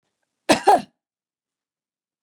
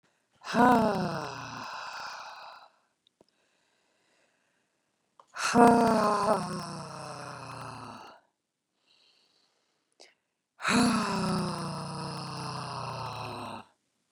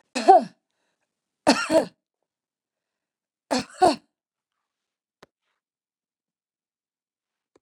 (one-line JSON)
{"cough_length": "2.2 s", "cough_amplitude": 25957, "cough_signal_mean_std_ratio": 0.24, "exhalation_length": "14.1 s", "exhalation_amplitude": 17462, "exhalation_signal_mean_std_ratio": 0.42, "three_cough_length": "7.6 s", "three_cough_amplitude": 29372, "three_cough_signal_mean_std_ratio": 0.23, "survey_phase": "beta (2021-08-13 to 2022-03-07)", "age": "65+", "gender": "Female", "wearing_mask": "No", "symptom_none": true, "smoker_status": "Ex-smoker", "respiratory_condition_asthma": false, "respiratory_condition_other": false, "recruitment_source": "Test and Trace", "submission_delay": "1 day", "covid_test_result": "Negative", "covid_test_method": "RT-qPCR"}